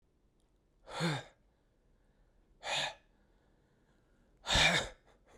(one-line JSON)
{"exhalation_length": "5.4 s", "exhalation_amplitude": 5856, "exhalation_signal_mean_std_ratio": 0.33, "survey_phase": "beta (2021-08-13 to 2022-03-07)", "age": "18-44", "gender": "Male", "wearing_mask": "No", "symptom_new_continuous_cough": true, "symptom_sore_throat": true, "symptom_fatigue": true, "symptom_headache": true, "symptom_change_to_sense_of_smell_or_taste": true, "symptom_loss_of_taste": true, "symptom_other": true, "symptom_onset": "3 days", "smoker_status": "Never smoked", "respiratory_condition_asthma": false, "respiratory_condition_other": false, "recruitment_source": "Test and Trace", "submission_delay": "1 day", "covid_test_result": "Positive", "covid_test_method": "RT-qPCR", "covid_ct_value": 20.7, "covid_ct_gene": "ORF1ab gene", "covid_ct_mean": 21.3, "covid_viral_load": "100000 copies/ml", "covid_viral_load_category": "Low viral load (10K-1M copies/ml)"}